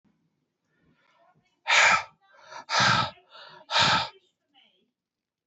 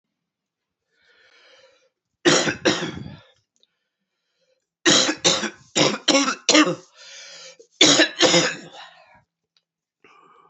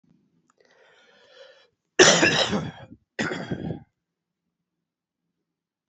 {"exhalation_length": "5.5 s", "exhalation_amplitude": 14128, "exhalation_signal_mean_std_ratio": 0.37, "three_cough_length": "10.5 s", "three_cough_amplitude": 29135, "three_cough_signal_mean_std_ratio": 0.38, "cough_length": "5.9 s", "cough_amplitude": 31076, "cough_signal_mean_std_ratio": 0.3, "survey_phase": "alpha (2021-03-01 to 2021-08-12)", "age": "45-64", "gender": "Male", "wearing_mask": "No", "symptom_new_continuous_cough": true, "symptom_diarrhoea": true, "symptom_fatigue": true, "symptom_onset": "3 days", "smoker_status": "Never smoked", "respiratory_condition_asthma": false, "respiratory_condition_other": false, "recruitment_source": "Test and Trace", "submission_delay": "1 day", "covid_test_result": "Positive", "covid_test_method": "RT-qPCR", "covid_ct_value": 14.9, "covid_ct_gene": "ORF1ab gene", "covid_ct_mean": 15.3, "covid_viral_load": "9900000 copies/ml", "covid_viral_load_category": "High viral load (>1M copies/ml)"}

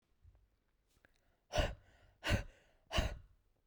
{"exhalation_length": "3.7 s", "exhalation_amplitude": 3249, "exhalation_signal_mean_std_ratio": 0.33, "survey_phase": "beta (2021-08-13 to 2022-03-07)", "age": "18-44", "gender": "Female", "wearing_mask": "Yes", "symptom_none": true, "smoker_status": "Current smoker (1 to 10 cigarettes per day)", "respiratory_condition_asthma": false, "respiratory_condition_other": false, "recruitment_source": "REACT", "submission_delay": "1 day", "covid_test_result": "Negative", "covid_test_method": "RT-qPCR", "influenza_a_test_result": "Negative", "influenza_b_test_result": "Negative"}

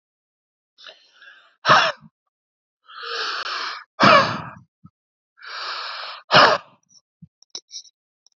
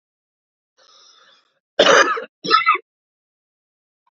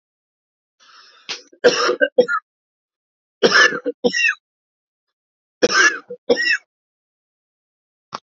{"exhalation_length": "8.4 s", "exhalation_amplitude": 32768, "exhalation_signal_mean_std_ratio": 0.33, "cough_length": "4.2 s", "cough_amplitude": 32767, "cough_signal_mean_std_ratio": 0.31, "three_cough_length": "8.3 s", "three_cough_amplitude": 28384, "three_cough_signal_mean_std_ratio": 0.36, "survey_phase": "alpha (2021-03-01 to 2021-08-12)", "age": "45-64", "gender": "Male", "wearing_mask": "No", "symptom_cough_any": true, "symptom_fatigue": true, "symptom_fever_high_temperature": true, "symptom_headache": true, "smoker_status": "Never smoked", "respiratory_condition_asthma": true, "respiratory_condition_other": false, "recruitment_source": "Test and Trace", "submission_delay": "2 days", "covid_test_result": "Positive", "covid_test_method": "RT-qPCR", "covid_ct_value": 16.7, "covid_ct_gene": "ORF1ab gene", "covid_ct_mean": 17.1, "covid_viral_load": "2400000 copies/ml", "covid_viral_load_category": "High viral load (>1M copies/ml)"}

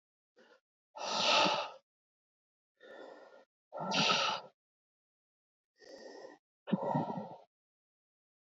{"exhalation_length": "8.4 s", "exhalation_amplitude": 5978, "exhalation_signal_mean_std_ratio": 0.39, "survey_phase": "beta (2021-08-13 to 2022-03-07)", "age": "45-64", "gender": "Male", "wearing_mask": "No", "symptom_none": true, "smoker_status": "Never smoked", "respiratory_condition_asthma": false, "respiratory_condition_other": false, "recruitment_source": "REACT", "submission_delay": "2 days", "covid_test_result": "Negative", "covid_test_method": "RT-qPCR", "influenza_a_test_result": "Negative", "influenza_b_test_result": "Negative"}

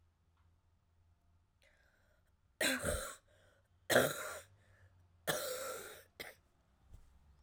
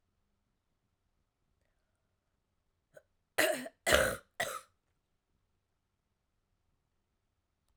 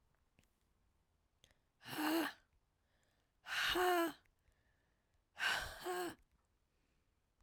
{"three_cough_length": "7.4 s", "three_cough_amplitude": 5164, "three_cough_signal_mean_std_ratio": 0.34, "cough_length": "7.8 s", "cough_amplitude": 12502, "cough_signal_mean_std_ratio": 0.22, "exhalation_length": "7.4 s", "exhalation_amplitude": 2421, "exhalation_signal_mean_std_ratio": 0.4, "survey_phase": "alpha (2021-03-01 to 2021-08-12)", "age": "18-44", "gender": "Female", "wearing_mask": "No", "symptom_fatigue": true, "symptom_fever_high_temperature": true, "symptom_headache": true, "smoker_status": "Never smoked", "respiratory_condition_asthma": true, "respiratory_condition_other": false, "recruitment_source": "Test and Trace", "submission_delay": "2 days", "covid_test_result": "Positive", "covid_test_method": "RT-qPCR", "covid_ct_value": 14.9, "covid_ct_gene": "ORF1ab gene", "covid_ct_mean": 15.0, "covid_viral_load": "12000000 copies/ml", "covid_viral_load_category": "High viral load (>1M copies/ml)"}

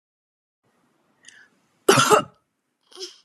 {"cough_length": "3.2 s", "cough_amplitude": 28066, "cough_signal_mean_std_ratio": 0.26, "survey_phase": "beta (2021-08-13 to 2022-03-07)", "age": "18-44", "gender": "Female", "wearing_mask": "No", "symptom_fatigue": true, "smoker_status": "Never smoked", "respiratory_condition_asthma": false, "respiratory_condition_other": false, "recruitment_source": "REACT", "submission_delay": "3 days", "covid_test_result": "Negative", "covid_test_method": "RT-qPCR", "influenza_a_test_result": "Negative", "influenza_b_test_result": "Negative"}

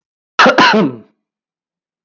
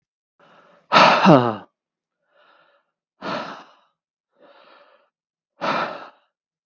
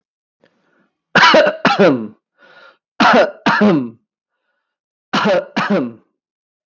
{"cough_length": "2.0 s", "cough_amplitude": 32329, "cough_signal_mean_std_ratio": 0.43, "exhalation_length": "6.7 s", "exhalation_amplitude": 32767, "exhalation_signal_mean_std_ratio": 0.28, "three_cough_length": "6.7 s", "three_cough_amplitude": 32767, "three_cough_signal_mean_std_ratio": 0.48, "survey_phase": "beta (2021-08-13 to 2022-03-07)", "age": "18-44", "gender": "Male", "wearing_mask": "No", "symptom_none": true, "smoker_status": "Never smoked", "respiratory_condition_asthma": false, "respiratory_condition_other": false, "recruitment_source": "REACT", "submission_delay": "0 days", "covid_test_result": "Negative", "covid_test_method": "RT-qPCR", "influenza_a_test_result": "Negative", "influenza_b_test_result": "Negative"}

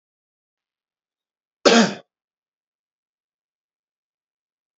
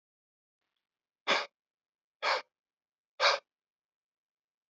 {"cough_length": "4.8 s", "cough_amplitude": 30005, "cough_signal_mean_std_ratio": 0.18, "exhalation_length": "4.7 s", "exhalation_amplitude": 9563, "exhalation_signal_mean_std_ratio": 0.25, "survey_phase": "beta (2021-08-13 to 2022-03-07)", "age": "18-44", "gender": "Male", "wearing_mask": "No", "symptom_cough_any": true, "smoker_status": "Never smoked", "respiratory_condition_asthma": false, "respiratory_condition_other": false, "recruitment_source": "REACT", "submission_delay": "1 day", "covid_test_result": "Negative", "covid_test_method": "RT-qPCR"}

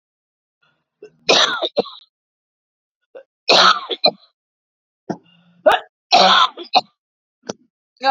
{"three_cough_length": "8.1 s", "three_cough_amplitude": 32768, "three_cough_signal_mean_std_ratio": 0.35, "survey_phase": "beta (2021-08-13 to 2022-03-07)", "age": "45-64", "gender": "Female", "wearing_mask": "No", "symptom_cough_any": true, "symptom_runny_or_blocked_nose": true, "symptom_sore_throat": true, "symptom_fatigue": true, "symptom_headache": true, "symptom_change_to_sense_of_smell_or_taste": true, "symptom_loss_of_taste": true, "symptom_onset": "2 days", "smoker_status": "Ex-smoker", "respiratory_condition_asthma": false, "respiratory_condition_other": false, "recruitment_source": "Test and Trace", "submission_delay": "1 day", "covid_test_result": "Positive", "covid_test_method": "RT-qPCR", "covid_ct_value": 18.8, "covid_ct_gene": "ORF1ab gene", "covid_ct_mean": 19.0, "covid_viral_load": "570000 copies/ml", "covid_viral_load_category": "Low viral load (10K-1M copies/ml)"}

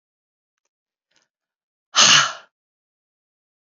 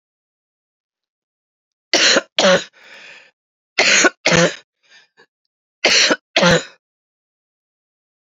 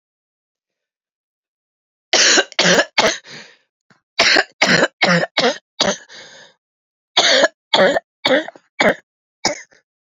{"exhalation_length": "3.7 s", "exhalation_amplitude": 32436, "exhalation_signal_mean_std_ratio": 0.24, "three_cough_length": "8.3 s", "three_cough_amplitude": 32767, "three_cough_signal_mean_std_ratio": 0.37, "cough_length": "10.2 s", "cough_amplitude": 32767, "cough_signal_mean_std_ratio": 0.43, "survey_phase": "beta (2021-08-13 to 2022-03-07)", "age": "18-44", "gender": "Female", "wearing_mask": "No", "symptom_cough_any": true, "symptom_new_continuous_cough": true, "symptom_runny_or_blocked_nose": true, "symptom_sore_throat": true, "symptom_fatigue": true, "symptom_headache": true, "symptom_onset": "4 days", "smoker_status": "Never smoked", "respiratory_condition_asthma": false, "respiratory_condition_other": false, "recruitment_source": "Test and Trace", "submission_delay": "2 days", "covid_test_result": "Positive", "covid_test_method": "RT-qPCR", "covid_ct_value": 9.8, "covid_ct_gene": "S gene"}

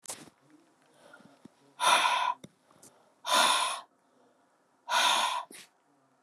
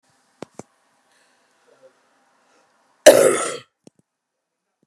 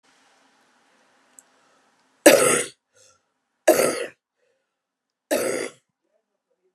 {"exhalation_length": "6.2 s", "exhalation_amplitude": 10078, "exhalation_signal_mean_std_ratio": 0.43, "cough_length": "4.9 s", "cough_amplitude": 32768, "cough_signal_mean_std_ratio": 0.2, "three_cough_length": "6.7 s", "three_cough_amplitude": 32768, "three_cough_signal_mean_std_ratio": 0.28, "survey_phase": "beta (2021-08-13 to 2022-03-07)", "age": "45-64", "gender": "Female", "wearing_mask": "No", "symptom_cough_any": true, "symptom_sore_throat": true, "symptom_abdominal_pain": true, "symptom_fatigue": true, "symptom_fever_high_temperature": true, "symptom_onset": "5 days", "smoker_status": "Never smoked", "respiratory_condition_asthma": false, "respiratory_condition_other": false, "recruitment_source": "Test and Trace", "submission_delay": "1 day", "covid_test_result": "Positive", "covid_test_method": "RT-qPCR", "covid_ct_value": 15.4, "covid_ct_gene": "ORF1ab gene", "covid_ct_mean": 15.8, "covid_viral_load": "6400000 copies/ml", "covid_viral_load_category": "High viral load (>1M copies/ml)"}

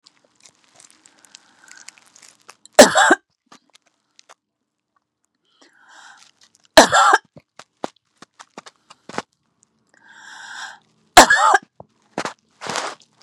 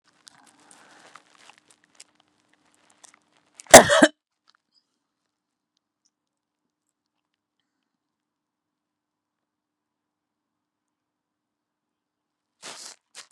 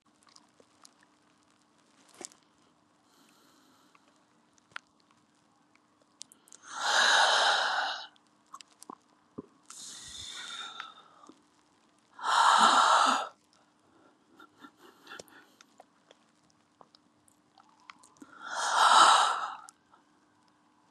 {"three_cough_length": "13.2 s", "three_cough_amplitude": 32768, "three_cough_signal_mean_std_ratio": 0.23, "cough_length": "13.3 s", "cough_amplitude": 32768, "cough_signal_mean_std_ratio": 0.11, "exhalation_length": "20.9 s", "exhalation_amplitude": 12619, "exhalation_signal_mean_std_ratio": 0.33, "survey_phase": "beta (2021-08-13 to 2022-03-07)", "age": "65+", "gender": "Female", "wearing_mask": "No", "symptom_none": true, "smoker_status": "Never smoked", "respiratory_condition_asthma": false, "respiratory_condition_other": false, "recruitment_source": "REACT", "submission_delay": "3 days", "covid_test_result": "Negative", "covid_test_method": "RT-qPCR", "influenza_a_test_result": "Negative", "influenza_b_test_result": "Negative"}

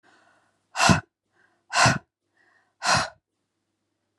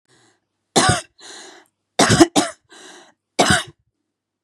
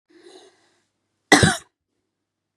{"exhalation_length": "4.2 s", "exhalation_amplitude": 22363, "exhalation_signal_mean_std_ratio": 0.32, "three_cough_length": "4.4 s", "three_cough_amplitude": 32768, "three_cough_signal_mean_std_ratio": 0.35, "cough_length": "2.6 s", "cough_amplitude": 32767, "cough_signal_mean_std_ratio": 0.23, "survey_phase": "beta (2021-08-13 to 2022-03-07)", "age": "45-64", "gender": "Female", "wearing_mask": "No", "symptom_new_continuous_cough": true, "symptom_onset": "8 days", "smoker_status": "Never smoked", "respiratory_condition_asthma": false, "respiratory_condition_other": false, "recruitment_source": "REACT", "submission_delay": "1 day", "covid_test_result": "Negative", "covid_test_method": "RT-qPCR", "influenza_a_test_result": "Negative", "influenza_b_test_result": "Negative"}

